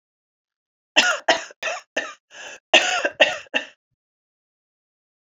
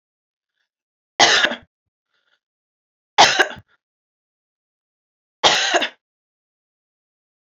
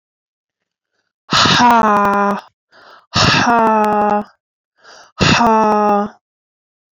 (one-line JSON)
{"cough_length": "5.2 s", "cough_amplitude": 31077, "cough_signal_mean_std_ratio": 0.34, "three_cough_length": "7.5 s", "three_cough_amplitude": 30703, "three_cough_signal_mean_std_ratio": 0.27, "exhalation_length": "6.9 s", "exhalation_amplitude": 32767, "exhalation_signal_mean_std_ratio": 0.57, "survey_phase": "alpha (2021-03-01 to 2021-08-12)", "age": "18-44", "gender": "Female", "wearing_mask": "No", "symptom_cough_any": true, "symptom_headache": true, "symptom_onset": "2 days", "smoker_status": "Ex-smoker", "respiratory_condition_asthma": true, "respiratory_condition_other": false, "recruitment_source": "Test and Trace", "submission_delay": "2 days", "covid_test_result": "Positive", "covid_test_method": "ePCR"}